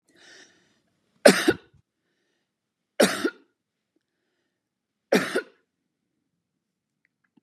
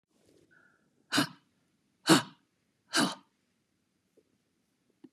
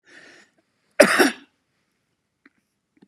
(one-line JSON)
{"three_cough_length": "7.4 s", "three_cough_amplitude": 32172, "three_cough_signal_mean_std_ratio": 0.21, "exhalation_length": "5.1 s", "exhalation_amplitude": 13326, "exhalation_signal_mean_std_ratio": 0.23, "cough_length": "3.1 s", "cough_amplitude": 32768, "cough_signal_mean_std_ratio": 0.23, "survey_phase": "beta (2021-08-13 to 2022-03-07)", "age": "65+", "gender": "Female", "wearing_mask": "No", "symptom_none": true, "smoker_status": "Ex-smoker", "respiratory_condition_asthma": false, "respiratory_condition_other": false, "recruitment_source": "REACT", "submission_delay": "1 day", "covid_test_result": "Negative", "covid_test_method": "RT-qPCR", "influenza_a_test_result": "Negative", "influenza_b_test_result": "Negative"}